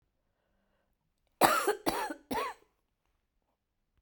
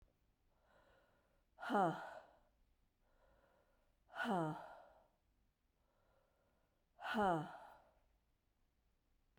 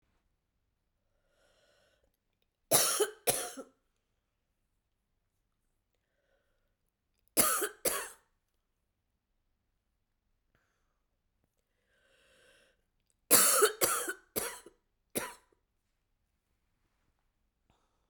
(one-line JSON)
{"cough_length": "4.0 s", "cough_amplitude": 15219, "cough_signal_mean_std_ratio": 0.32, "exhalation_length": "9.4 s", "exhalation_amplitude": 1736, "exhalation_signal_mean_std_ratio": 0.32, "three_cough_length": "18.1 s", "three_cough_amplitude": 12115, "three_cough_signal_mean_std_ratio": 0.25, "survey_phase": "beta (2021-08-13 to 2022-03-07)", "age": "45-64", "gender": "Female", "wearing_mask": "No", "symptom_cough_any": true, "symptom_new_continuous_cough": true, "symptom_runny_or_blocked_nose": true, "symptom_shortness_of_breath": true, "symptom_abdominal_pain": true, "symptom_diarrhoea": true, "symptom_fatigue": true, "symptom_headache": true, "symptom_change_to_sense_of_smell_or_taste": true, "symptom_onset": "4 days", "smoker_status": "Never smoked", "respiratory_condition_asthma": true, "respiratory_condition_other": false, "recruitment_source": "Test and Trace", "submission_delay": "2 days", "covid_test_result": "Positive", "covid_test_method": "RT-qPCR"}